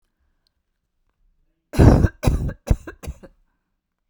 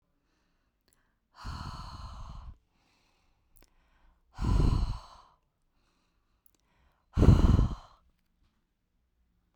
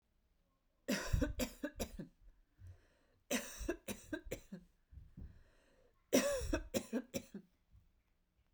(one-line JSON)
{"cough_length": "4.1 s", "cough_amplitude": 32768, "cough_signal_mean_std_ratio": 0.3, "exhalation_length": "9.6 s", "exhalation_amplitude": 12762, "exhalation_signal_mean_std_ratio": 0.29, "three_cough_length": "8.5 s", "three_cough_amplitude": 3929, "three_cough_signal_mean_std_ratio": 0.42, "survey_phase": "beta (2021-08-13 to 2022-03-07)", "age": "18-44", "gender": "Female", "wearing_mask": "No", "symptom_none": true, "smoker_status": "Never smoked", "respiratory_condition_asthma": false, "respiratory_condition_other": false, "recruitment_source": "REACT", "submission_delay": "3 days", "covid_test_result": "Negative", "covid_test_method": "RT-qPCR"}